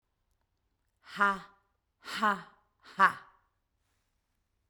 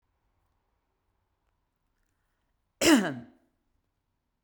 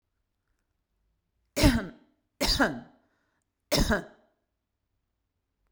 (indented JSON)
{
  "exhalation_length": "4.7 s",
  "exhalation_amplitude": 11218,
  "exhalation_signal_mean_std_ratio": 0.25,
  "cough_length": "4.4 s",
  "cough_amplitude": 13827,
  "cough_signal_mean_std_ratio": 0.2,
  "three_cough_length": "5.7 s",
  "three_cough_amplitude": 15810,
  "three_cough_signal_mean_std_ratio": 0.3,
  "survey_phase": "beta (2021-08-13 to 2022-03-07)",
  "age": "45-64",
  "gender": "Female",
  "wearing_mask": "No",
  "symptom_none": true,
  "smoker_status": "Never smoked",
  "respiratory_condition_asthma": false,
  "respiratory_condition_other": false,
  "recruitment_source": "REACT",
  "submission_delay": "1 day",
  "covid_test_result": "Negative",
  "covid_test_method": "RT-qPCR",
  "influenza_a_test_result": "Negative",
  "influenza_b_test_result": "Negative"
}